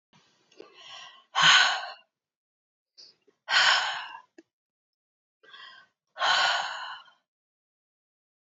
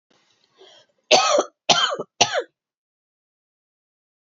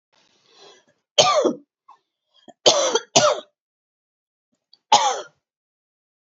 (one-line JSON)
{"exhalation_length": "8.5 s", "exhalation_amplitude": 18337, "exhalation_signal_mean_std_ratio": 0.34, "cough_length": "4.4 s", "cough_amplitude": 30143, "cough_signal_mean_std_ratio": 0.32, "three_cough_length": "6.2 s", "three_cough_amplitude": 30551, "three_cough_signal_mean_std_ratio": 0.33, "survey_phase": "beta (2021-08-13 to 2022-03-07)", "age": "45-64", "gender": "Female", "wearing_mask": "No", "symptom_none": true, "symptom_onset": "12 days", "smoker_status": "Never smoked", "respiratory_condition_asthma": false, "respiratory_condition_other": false, "recruitment_source": "REACT", "submission_delay": "4 days", "covid_test_result": "Negative", "covid_test_method": "RT-qPCR", "influenza_a_test_result": "Negative", "influenza_b_test_result": "Negative"}